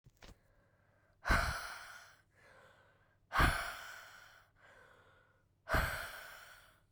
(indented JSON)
{
  "exhalation_length": "6.9 s",
  "exhalation_amplitude": 4329,
  "exhalation_signal_mean_std_ratio": 0.37,
  "survey_phase": "beta (2021-08-13 to 2022-03-07)",
  "age": "18-44",
  "gender": "Female",
  "wearing_mask": "No",
  "symptom_cough_any": true,
  "symptom_runny_or_blocked_nose": true,
  "symptom_shortness_of_breath": true,
  "symptom_sore_throat": true,
  "symptom_fatigue": true,
  "symptom_headache": true,
  "symptom_change_to_sense_of_smell_or_taste": true,
  "smoker_status": "Never smoked",
  "respiratory_condition_asthma": false,
  "respiratory_condition_other": false,
  "recruitment_source": "Test and Trace",
  "submission_delay": "2 days",
  "covid_test_result": "Positive",
  "covid_test_method": "LFT"
}